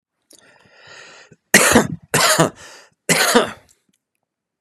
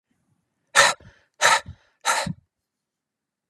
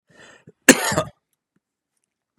{"three_cough_length": "4.6 s", "three_cough_amplitude": 32768, "three_cough_signal_mean_std_ratio": 0.39, "exhalation_length": "3.5 s", "exhalation_amplitude": 29998, "exhalation_signal_mean_std_ratio": 0.32, "cough_length": "2.4 s", "cough_amplitude": 32768, "cough_signal_mean_std_ratio": 0.22, "survey_phase": "beta (2021-08-13 to 2022-03-07)", "age": "45-64", "gender": "Male", "wearing_mask": "No", "symptom_cough_any": true, "symptom_runny_or_blocked_nose": true, "symptom_change_to_sense_of_smell_or_taste": true, "symptom_onset": "7 days", "smoker_status": "Never smoked", "respiratory_condition_asthma": true, "respiratory_condition_other": false, "recruitment_source": "REACT", "submission_delay": "1 day", "covid_test_result": "Negative", "covid_test_method": "RT-qPCR", "influenza_a_test_result": "Negative", "influenza_b_test_result": "Negative"}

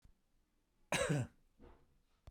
{"cough_length": "2.3 s", "cough_amplitude": 2681, "cough_signal_mean_std_ratio": 0.35, "survey_phase": "beta (2021-08-13 to 2022-03-07)", "age": "45-64", "gender": "Male", "wearing_mask": "No", "symptom_none": true, "symptom_onset": "13 days", "smoker_status": "Ex-smoker", "respiratory_condition_asthma": true, "respiratory_condition_other": false, "recruitment_source": "REACT", "submission_delay": "2 days", "covid_test_result": "Negative", "covid_test_method": "RT-qPCR"}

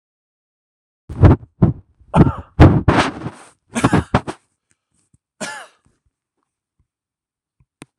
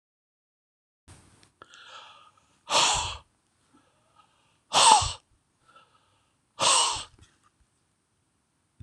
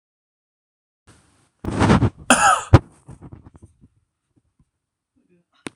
{"three_cough_length": "8.0 s", "three_cough_amplitude": 26028, "three_cough_signal_mean_std_ratio": 0.31, "exhalation_length": "8.8 s", "exhalation_amplitude": 21441, "exhalation_signal_mean_std_ratio": 0.29, "cough_length": "5.8 s", "cough_amplitude": 26028, "cough_signal_mean_std_ratio": 0.28, "survey_phase": "alpha (2021-03-01 to 2021-08-12)", "age": "45-64", "gender": "Male", "wearing_mask": "No", "symptom_none": true, "smoker_status": "Never smoked", "respiratory_condition_asthma": false, "respiratory_condition_other": false, "recruitment_source": "REACT", "submission_delay": "2 days", "covid_test_result": "Negative", "covid_test_method": "RT-qPCR"}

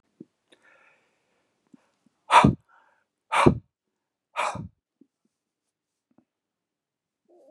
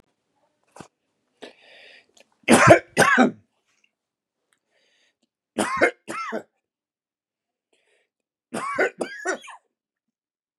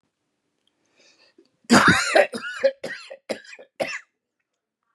{"exhalation_length": "7.5 s", "exhalation_amplitude": 28363, "exhalation_signal_mean_std_ratio": 0.21, "three_cough_length": "10.6 s", "three_cough_amplitude": 32559, "three_cough_signal_mean_std_ratio": 0.27, "cough_length": "4.9 s", "cough_amplitude": 26950, "cough_signal_mean_std_ratio": 0.33, "survey_phase": "beta (2021-08-13 to 2022-03-07)", "age": "45-64", "gender": "Male", "wearing_mask": "No", "symptom_diarrhoea": true, "symptom_fatigue": true, "smoker_status": "Ex-smoker", "respiratory_condition_asthma": false, "respiratory_condition_other": false, "recruitment_source": "REACT", "submission_delay": "3 days", "covid_test_result": "Negative", "covid_test_method": "RT-qPCR", "covid_ct_value": 39.0, "covid_ct_gene": "N gene", "influenza_a_test_result": "Negative", "influenza_b_test_result": "Negative"}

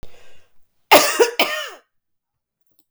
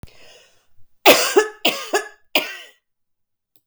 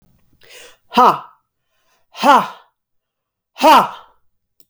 {"cough_length": "2.9 s", "cough_amplitude": 32768, "cough_signal_mean_std_ratio": 0.35, "three_cough_length": "3.7 s", "three_cough_amplitude": 32768, "three_cough_signal_mean_std_ratio": 0.34, "exhalation_length": "4.7 s", "exhalation_amplitude": 32766, "exhalation_signal_mean_std_ratio": 0.33, "survey_phase": "beta (2021-08-13 to 2022-03-07)", "age": "45-64", "gender": "Female", "wearing_mask": "No", "symptom_cough_any": true, "symptom_runny_or_blocked_nose": true, "symptom_headache": true, "symptom_other": true, "symptom_onset": "3 days", "smoker_status": "Ex-smoker", "respiratory_condition_asthma": false, "respiratory_condition_other": false, "recruitment_source": "Test and Trace", "submission_delay": "1 day", "covid_test_result": "Positive", "covid_test_method": "RT-qPCR", "covid_ct_value": 24.4, "covid_ct_gene": "ORF1ab gene"}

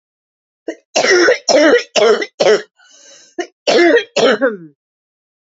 {"cough_length": "5.5 s", "cough_amplitude": 31553, "cough_signal_mean_std_ratio": 0.54, "survey_phase": "beta (2021-08-13 to 2022-03-07)", "age": "18-44", "gender": "Female", "wearing_mask": "No", "symptom_cough_any": true, "symptom_shortness_of_breath": true, "symptom_headache": true, "symptom_change_to_sense_of_smell_or_taste": true, "smoker_status": "Never smoked", "respiratory_condition_asthma": true, "respiratory_condition_other": false, "recruitment_source": "Test and Trace", "submission_delay": "0 days", "covid_test_result": "Positive", "covid_test_method": "RT-qPCR", "covid_ct_value": 15.9, "covid_ct_gene": "S gene", "covid_ct_mean": 16.0, "covid_viral_load": "5500000 copies/ml", "covid_viral_load_category": "High viral load (>1M copies/ml)"}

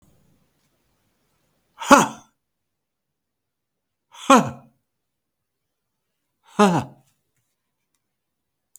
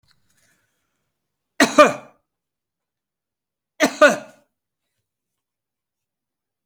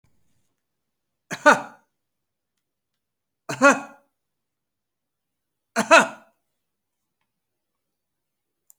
{"exhalation_length": "8.8 s", "exhalation_amplitude": 31054, "exhalation_signal_mean_std_ratio": 0.2, "cough_length": "6.7 s", "cough_amplitude": 32768, "cough_signal_mean_std_ratio": 0.2, "three_cough_length": "8.8 s", "three_cough_amplitude": 29172, "three_cough_signal_mean_std_ratio": 0.19, "survey_phase": "alpha (2021-03-01 to 2021-08-12)", "age": "65+", "gender": "Male", "wearing_mask": "No", "symptom_none": true, "smoker_status": "Never smoked", "respiratory_condition_asthma": false, "respiratory_condition_other": false, "recruitment_source": "REACT", "submission_delay": "2 days", "covid_test_result": "Negative", "covid_test_method": "RT-qPCR"}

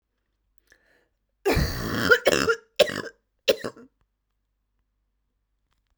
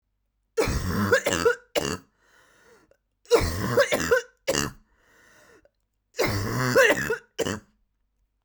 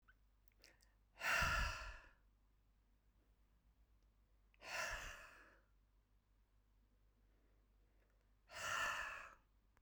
{"cough_length": "6.0 s", "cough_amplitude": 27115, "cough_signal_mean_std_ratio": 0.32, "three_cough_length": "8.4 s", "three_cough_amplitude": 17466, "three_cough_signal_mean_std_ratio": 0.48, "exhalation_length": "9.8 s", "exhalation_amplitude": 1638, "exhalation_signal_mean_std_ratio": 0.38, "survey_phase": "beta (2021-08-13 to 2022-03-07)", "age": "18-44", "gender": "Female", "wearing_mask": "No", "symptom_cough_any": true, "symptom_new_continuous_cough": true, "symptom_runny_or_blocked_nose": true, "symptom_sore_throat": true, "symptom_fatigue": true, "symptom_fever_high_temperature": true, "symptom_headache": true, "symptom_onset": "6 days", "smoker_status": "Never smoked", "respiratory_condition_asthma": false, "respiratory_condition_other": false, "recruitment_source": "Test and Trace", "submission_delay": "2 days", "covid_test_result": "Positive", "covid_test_method": "RT-qPCR"}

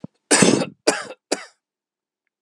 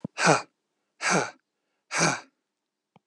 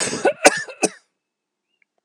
{"three_cough_length": "2.4 s", "three_cough_amplitude": 32767, "three_cough_signal_mean_std_ratio": 0.35, "exhalation_length": "3.1 s", "exhalation_amplitude": 19955, "exhalation_signal_mean_std_ratio": 0.37, "cough_length": "2.0 s", "cough_amplitude": 32768, "cough_signal_mean_std_ratio": 0.33, "survey_phase": "alpha (2021-03-01 to 2021-08-12)", "age": "65+", "gender": "Male", "wearing_mask": "No", "symptom_none": true, "smoker_status": "Never smoked", "respiratory_condition_asthma": false, "respiratory_condition_other": false, "recruitment_source": "REACT", "submission_delay": "2 days", "covid_test_result": "Negative", "covid_test_method": "RT-qPCR"}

